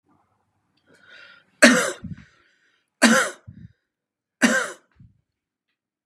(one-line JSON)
{"three_cough_length": "6.1 s", "three_cough_amplitude": 32767, "three_cough_signal_mean_std_ratio": 0.28, "survey_phase": "beta (2021-08-13 to 2022-03-07)", "age": "45-64", "gender": "Male", "wearing_mask": "No", "symptom_none": true, "smoker_status": "Never smoked", "respiratory_condition_asthma": false, "respiratory_condition_other": false, "recruitment_source": "REACT", "submission_delay": "1 day", "covid_test_result": "Negative", "covid_test_method": "RT-qPCR", "influenza_a_test_result": "Negative", "influenza_b_test_result": "Negative"}